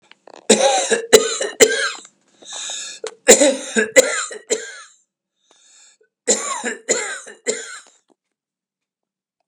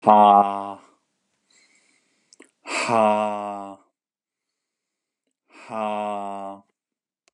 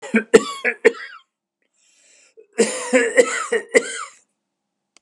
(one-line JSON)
{"three_cough_length": "9.5 s", "three_cough_amplitude": 32768, "three_cough_signal_mean_std_ratio": 0.4, "exhalation_length": "7.3 s", "exhalation_amplitude": 31850, "exhalation_signal_mean_std_ratio": 0.35, "cough_length": "5.0 s", "cough_amplitude": 32768, "cough_signal_mean_std_ratio": 0.37, "survey_phase": "beta (2021-08-13 to 2022-03-07)", "age": "65+", "gender": "Male", "wearing_mask": "No", "symptom_none": true, "smoker_status": "Never smoked", "respiratory_condition_asthma": false, "respiratory_condition_other": false, "recruitment_source": "REACT", "submission_delay": "1 day", "covid_test_result": "Negative", "covid_test_method": "RT-qPCR", "influenza_a_test_result": "Negative", "influenza_b_test_result": "Negative"}